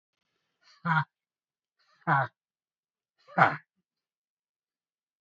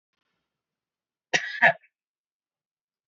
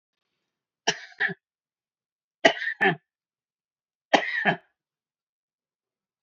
{"exhalation_length": "5.2 s", "exhalation_amplitude": 17939, "exhalation_signal_mean_std_ratio": 0.24, "cough_length": "3.1 s", "cough_amplitude": 19915, "cough_signal_mean_std_ratio": 0.2, "three_cough_length": "6.2 s", "three_cough_amplitude": 26874, "three_cough_signal_mean_std_ratio": 0.26, "survey_phase": "beta (2021-08-13 to 2022-03-07)", "age": "65+", "gender": "Male", "wearing_mask": "No", "symptom_none": true, "smoker_status": "Never smoked", "respiratory_condition_asthma": false, "respiratory_condition_other": false, "recruitment_source": "REACT", "submission_delay": "2 days", "covid_test_result": "Negative", "covid_test_method": "RT-qPCR", "influenza_a_test_result": "Negative", "influenza_b_test_result": "Negative"}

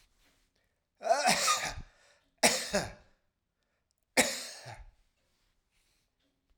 {"cough_length": "6.6 s", "cough_amplitude": 15893, "cough_signal_mean_std_ratio": 0.35, "survey_phase": "alpha (2021-03-01 to 2021-08-12)", "age": "45-64", "gender": "Male", "wearing_mask": "No", "symptom_none": true, "smoker_status": "Ex-smoker", "respiratory_condition_asthma": false, "respiratory_condition_other": false, "recruitment_source": "REACT", "submission_delay": "1 day", "covid_test_result": "Negative", "covid_test_method": "RT-qPCR"}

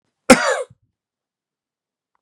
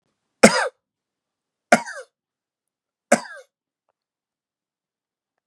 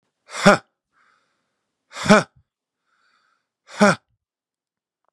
{"cough_length": "2.2 s", "cough_amplitude": 32768, "cough_signal_mean_std_ratio": 0.23, "three_cough_length": "5.5 s", "three_cough_amplitude": 32768, "three_cough_signal_mean_std_ratio": 0.18, "exhalation_length": "5.1 s", "exhalation_amplitude": 32767, "exhalation_signal_mean_std_ratio": 0.22, "survey_phase": "beta (2021-08-13 to 2022-03-07)", "age": "45-64", "gender": "Male", "wearing_mask": "No", "symptom_none": true, "smoker_status": "Never smoked", "respiratory_condition_asthma": false, "respiratory_condition_other": false, "recruitment_source": "REACT", "submission_delay": "1 day", "covid_test_result": "Negative", "covid_test_method": "RT-qPCR", "influenza_a_test_result": "Negative", "influenza_b_test_result": "Negative"}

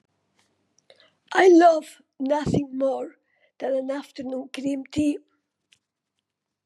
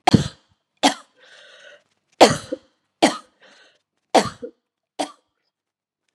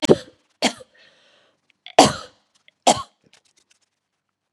{"exhalation_length": "6.7 s", "exhalation_amplitude": 18738, "exhalation_signal_mean_std_ratio": 0.44, "three_cough_length": "6.1 s", "three_cough_amplitude": 32768, "three_cough_signal_mean_std_ratio": 0.24, "cough_length": "4.5 s", "cough_amplitude": 32768, "cough_signal_mean_std_ratio": 0.23, "survey_phase": "beta (2021-08-13 to 2022-03-07)", "age": "45-64", "gender": "Female", "wearing_mask": "No", "symptom_sore_throat": true, "symptom_fatigue": true, "smoker_status": "Ex-smoker", "respiratory_condition_asthma": false, "respiratory_condition_other": false, "recruitment_source": "Test and Trace", "submission_delay": "1 day", "covid_test_result": "Negative", "covid_test_method": "RT-qPCR"}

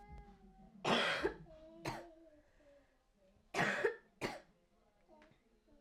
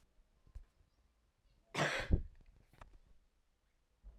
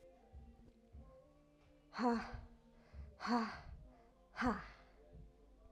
{"three_cough_length": "5.8 s", "three_cough_amplitude": 2776, "three_cough_signal_mean_std_ratio": 0.41, "cough_length": "4.2 s", "cough_amplitude": 3765, "cough_signal_mean_std_ratio": 0.28, "exhalation_length": "5.7 s", "exhalation_amplitude": 2138, "exhalation_signal_mean_std_ratio": 0.43, "survey_phase": "alpha (2021-03-01 to 2021-08-12)", "age": "18-44", "gender": "Female", "wearing_mask": "No", "symptom_cough_any": true, "symptom_fatigue": true, "symptom_headache": true, "symptom_change_to_sense_of_smell_or_taste": true, "smoker_status": "Never smoked", "respiratory_condition_asthma": false, "respiratory_condition_other": false, "recruitment_source": "Test and Trace", "submission_delay": "1 day", "covid_test_result": "Positive", "covid_test_method": "RT-qPCR", "covid_ct_value": 10.6, "covid_ct_gene": "N gene", "covid_ct_mean": 11.7, "covid_viral_load": "150000000 copies/ml", "covid_viral_load_category": "High viral load (>1M copies/ml)"}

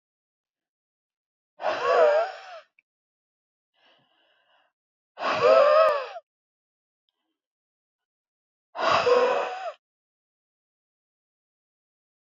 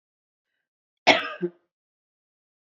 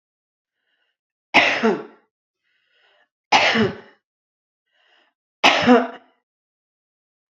{"exhalation_length": "12.2 s", "exhalation_amplitude": 15481, "exhalation_signal_mean_std_ratio": 0.35, "cough_length": "2.6 s", "cough_amplitude": 27381, "cough_signal_mean_std_ratio": 0.21, "three_cough_length": "7.3 s", "three_cough_amplitude": 29321, "three_cough_signal_mean_std_ratio": 0.32, "survey_phase": "beta (2021-08-13 to 2022-03-07)", "age": "45-64", "gender": "Female", "wearing_mask": "No", "symptom_none": true, "symptom_onset": "13 days", "smoker_status": "Never smoked", "respiratory_condition_asthma": false, "respiratory_condition_other": false, "recruitment_source": "REACT", "submission_delay": "1 day", "covid_test_result": "Negative", "covid_test_method": "RT-qPCR", "influenza_a_test_result": "Unknown/Void", "influenza_b_test_result": "Unknown/Void"}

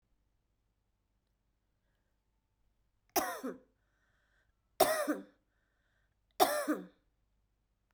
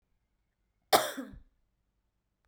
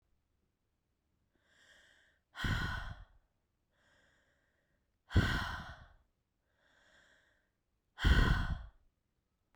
{"three_cough_length": "7.9 s", "three_cough_amplitude": 8734, "three_cough_signal_mean_std_ratio": 0.26, "cough_length": "2.5 s", "cough_amplitude": 13762, "cough_signal_mean_std_ratio": 0.21, "exhalation_length": "9.6 s", "exhalation_amplitude": 5591, "exhalation_signal_mean_std_ratio": 0.3, "survey_phase": "beta (2021-08-13 to 2022-03-07)", "age": "45-64", "gender": "Female", "wearing_mask": "No", "symptom_runny_or_blocked_nose": true, "symptom_shortness_of_breath": true, "symptom_abdominal_pain": true, "symptom_fatigue": true, "symptom_headache": true, "symptom_change_to_sense_of_smell_or_taste": true, "symptom_loss_of_taste": true, "symptom_onset": "7 days", "smoker_status": "Ex-smoker", "respiratory_condition_asthma": false, "respiratory_condition_other": false, "recruitment_source": "Test and Trace", "submission_delay": "1 day", "covid_test_result": "Positive", "covid_test_method": "RT-qPCR"}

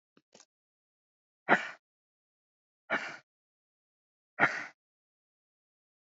{"exhalation_length": "6.1 s", "exhalation_amplitude": 14891, "exhalation_signal_mean_std_ratio": 0.2, "survey_phase": "alpha (2021-03-01 to 2021-08-12)", "age": "45-64", "gender": "Female", "wearing_mask": "No", "symptom_none": true, "smoker_status": "Never smoked", "respiratory_condition_asthma": false, "respiratory_condition_other": false, "recruitment_source": "REACT", "submission_delay": "1 day", "covid_test_result": "Negative", "covid_test_method": "RT-qPCR"}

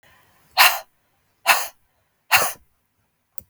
{"exhalation_length": "3.5 s", "exhalation_amplitude": 32768, "exhalation_signal_mean_std_ratio": 0.3, "survey_phase": "beta (2021-08-13 to 2022-03-07)", "age": "45-64", "gender": "Female", "wearing_mask": "No", "symptom_none": true, "smoker_status": "Never smoked", "respiratory_condition_asthma": false, "respiratory_condition_other": false, "recruitment_source": "REACT", "submission_delay": "2 days", "covid_test_result": "Negative", "covid_test_method": "RT-qPCR", "influenza_a_test_result": "Negative", "influenza_b_test_result": "Negative"}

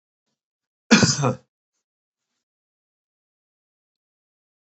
{"cough_length": "4.8 s", "cough_amplitude": 28611, "cough_signal_mean_std_ratio": 0.21, "survey_phase": "beta (2021-08-13 to 2022-03-07)", "age": "65+", "gender": "Male", "wearing_mask": "No", "symptom_none": true, "smoker_status": "Never smoked", "respiratory_condition_asthma": false, "respiratory_condition_other": false, "recruitment_source": "REACT", "submission_delay": "2 days", "covid_test_result": "Negative", "covid_test_method": "RT-qPCR", "influenza_a_test_result": "Negative", "influenza_b_test_result": "Negative"}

